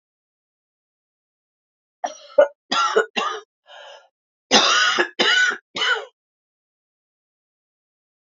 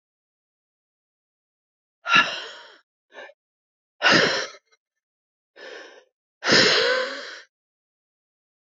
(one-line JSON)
{"cough_length": "8.4 s", "cough_amplitude": 29639, "cough_signal_mean_std_ratio": 0.37, "exhalation_length": "8.6 s", "exhalation_amplitude": 22565, "exhalation_signal_mean_std_ratio": 0.33, "survey_phase": "alpha (2021-03-01 to 2021-08-12)", "age": "45-64", "gender": "Female", "wearing_mask": "Yes", "symptom_cough_any": true, "symptom_shortness_of_breath": true, "symptom_fatigue": true, "symptom_headache": true, "symptom_onset": "3 days", "smoker_status": "Ex-smoker", "respiratory_condition_asthma": false, "respiratory_condition_other": false, "recruitment_source": "Test and Trace", "submission_delay": "1 day", "covid_test_result": "Positive", "covid_test_method": "RT-qPCR", "covid_ct_value": 18.1, "covid_ct_gene": "ORF1ab gene", "covid_ct_mean": 18.4, "covid_viral_load": "900000 copies/ml", "covid_viral_load_category": "Low viral load (10K-1M copies/ml)"}